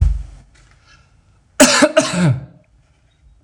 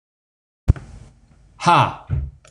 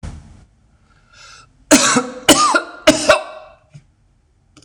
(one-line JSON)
{"cough_length": "3.4 s", "cough_amplitude": 26028, "cough_signal_mean_std_ratio": 0.43, "exhalation_length": "2.5 s", "exhalation_amplitude": 26027, "exhalation_signal_mean_std_ratio": 0.34, "three_cough_length": "4.6 s", "three_cough_amplitude": 26028, "three_cough_signal_mean_std_ratio": 0.39, "survey_phase": "beta (2021-08-13 to 2022-03-07)", "age": "45-64", "gender": "Male", "wearing_mask": "No", "symptom_none": true, "smoker_status": "Never smoked", "respiratory_condition_asthma": false, "respiratory_condition_other": false, "recruitment_source": "REACT", "submission_delay": "3 days", "covid_test_result": "Negative", "covid_test_method": "RT-qPCR", "influenza_a_test_result": "Negative", "influenza_b_test_result": "Negative"}